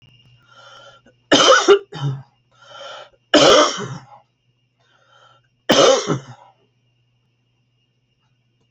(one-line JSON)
{"three_cough_length": "8.7 s", "three_cough_amplitude": 31686, "three_cough_signal_mean_std_ratio": 0.35, "survey_phase": "beta (2021-08-13 to 2022-03-07)", "age": "65+", "gender": "Female", "wearing_mask": "No", "symptom_none": true, "smoker_status": "Ex-smoker", "respiratory_condition_asthma": false, "respiratory_condition_other": false, "recruitment_source": "REACT", "submission_delay": "2 days", "covid_test_result": "Negative", "covid_test_method": "RT-qPCR"}